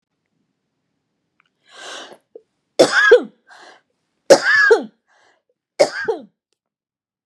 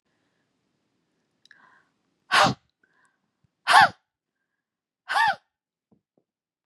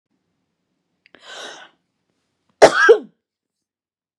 {"three_cough_length": "7.3 s", "three_cough_amplitude": 32768, "three_cough_signal_mean_std_ratio": 0.31, "exhalation_length": "6.7 s", "exhalation_amplitude": 25011, "exhalation_signal_mean_std_ratio": 0.24, "cough_length": "4.2 s", "cough_amplitude": 32768, "cough_signal_mean_std_ratio": 0.22, "survey_phase": "beta (2021-08-13 to 2022-03-07)", "age": "45-64", "gender": "Female", "wearing_mask": "No", "symptom_none": true, "smoker_status": "Never smoked", "respiratory_condition_asthma": false, "respiratory_condition_other": false, "recruitment_source": "REACT", "submission_delay": "2 days", "covid_test_result": "Negative", "covid_test_method": "RT-qPCR", "influenza_a_test_result": "Negative", "influenza_b_test_result": "Negative"}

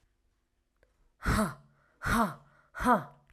{"exhalation_length": "3.3 s", "exhalation_amplitude": 7457, "exhalation_signal_mean_std_ratio": 0.4, "survey_phase": "alpha (2021-03-01 to 2021-08-12)", "age": "18-44", "gender": "Female", "wearing_mask": "No", "symptom_cough_any": true, "smoker_status": "Never smoked", "respiratory_condition_asthma": false, "respiratory_condition_other": false, "recruitment_source": "REACT", "submission_delay": "6 days", "covid_test_result": "Negative", "covid_test_method": "RT-qPCR"}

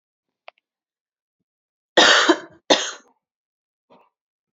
{"cough_length": "4.5 s", "cough_amplitude": 28521, "cough_signal_mean_std_ratio": 0.27, "survey_phase": "beta (2021-08-13 to 2022-03-07)", "age": "18-44", "gender": "Female", "wearing_mask": "No", "symptom_cough_any": true, "symptom_runny_or_blocked_nose": true, "symptom_diarrhoea": true, "symptom_fatigue": true, "symptom_headache": true, "symptom_change_to_sense_of_smell_or_taste": true, "symptom_loss_of_taste": true, "symptom_onset": "4 days", "smoker_status": "Never smoked", "respiratory_condition_asthma": false, "respiratory_condition_other": false, "recruitment_source": "Test and Trace", "submission_delay": "2 days", "covid_test_result": "Positive", "covid_test_method": "RT-qPCR"}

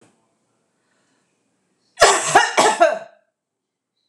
{"cough_length": "4.1 s", "cough_amplitude": 26028, "cough_signal_mean_std_ratio": 0.35, "survey_phase": "beta (2021-08-13 to 2022-03-07)", "age": "45-64", "gender": "Female", "wearing_mask": "No", "symptom_none": true, "smoker_status": "Ex-smoker", "respiratory_condition_asthma": false, "respiratory_condition_other": false, "recruitment_source": "REACT", "submission_delay": "1 day", "covid_test_result": "Negative", "covid_test_method": "RT-qPCR", "influenza_a_test_result": "Unknown/Void", "influenza_b_test_result": "Unknown/Void"}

